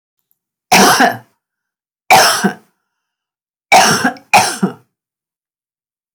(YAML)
three_cough_length: 6.1 s
three_cough_amplitude: 32768
three_cough_signal_mean_std_ratio: 0.41
survey_phase: beta (2021-08-13 to 2022-03-07)
age: 65+
gender: Female
wearing_mask: 'No'
symptom_fatigue: true
smoker_status: Never smoked
respiratory_condition_asthma: false
respiratory_condition_other: false
recruitment_source: REACT
submission_delay: 2 days
covid_test_result: Negative
covid_test_method: RT-qPCR
influenza_a_test_result: Negative
influenza_b_test_result: Negative